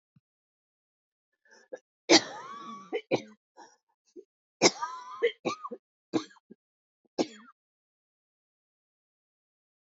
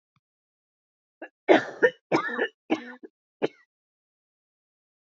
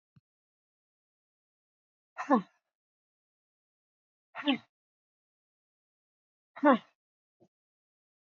{"three_cough_length": "9.9 s", "three_cough_amplitude": 15007, "three_cough_signal_mean_std_ratio": 0.23, "cough_length": "5.1 s", "cough_amplitude": 20752, "cough_signal_mean_std_ratio": 0.26, "exhalation_length": "8.3 s", "exhalation_amplitude": 10556, "exhalation_signal_mean_std_ratio": 0.17, "survey_phase": "beta (2021-08-13 to 2022-03-07)", "age": "45-64", "gender": "Female", "wearing_mask": "No", "symptom_cough_any": true, "symptom_runny_or_blocked_nose": true, "symptom_sore_throat": true, "symptom_fatigue": true, "symptom_headache": true, "symptom_onset": "3 days", "smoker_status": "Never smoked", "respiratory_condition_asthma": false, "respiratory_condition_other": false, "recruitment_source": "Test and Trace", "submission_delay": "0 days", "covid_test_result": "Positive", "covid_test_method": "RT-qPCR", "covid_ct_value": 24.5, "covid_ct_gene": "ORF1ab gene"}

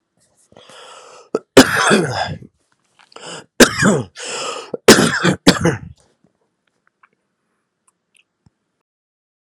{"three_cough_length": "9.6 s", "three_cough_amplitude": 32768, "three_cough_signal_mean_std_ratio": 0.33, "survey_phase": "beta (2021-08-13 to 2022-03-07)", "age": "18-44", "gender": "Male", "wearing_mask": "No", "symptom_none": true, "symptom_onset": "12 days", "smoker_status": "Ex-smoker", "respiratory_condition_asthma": true, "respiratory_condition_other": false, "recruitment_source": "Test and Trace", "submission_delay": "5 days", "covid_test_method": "RT-qPCR"}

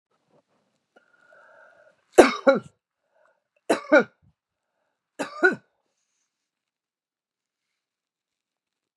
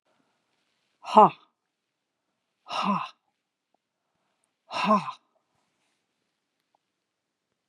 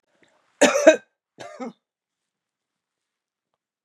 {"three_cough_length": "9.0 s", "three_cough_amplitude": 32768, "three_cough_signal_mean_std_ratio": 0.19, "exhalation_length": "7.7 s", "exhalation_amplitude": 22555, "exhalation_signal_mean_std_ratio": 0.21, "cough_length": "3.8 s", "cough_amplitude": 30450, "cough_signal_mean_std_ratio": 0.22, "survey_phase": "beta (2021-08-13 to 2022-03-07)", "age": "65+", "gender": "Female", "wearing_mask": "No", "symptom_none": true, "smoker_status": "Never smoked", "respiratory_condition_asthma": false, "respiratory_condition_other": false, "recruitment_source": "REACT", "submission_delay": "2 days", "covid_test_result": "Negative", "covid_test_method": "RT-qPCR", "influenza_a_test_result": "Negative", "influenza_b_test_result": "Negative"}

